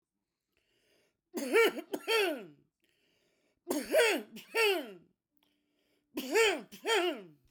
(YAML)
three_cough_length: 7.5 s
three_cough_amplitude: 6014
three_cough_signal_mean_std_ratio: 0.45
survey_phase: beta (2021-08-13 to 2022-03-07)
age: 45-64
gender: Female
wearing_mask: 'No'
symptom_none: true
smoker_status: Never smoked
respiratory_condition_asthma: false
respiratory_condition_other: false
recruitment_source: REACT
submission_delay: 3 days
covid_test_result: Negative
covid_test_method: RT-qPCR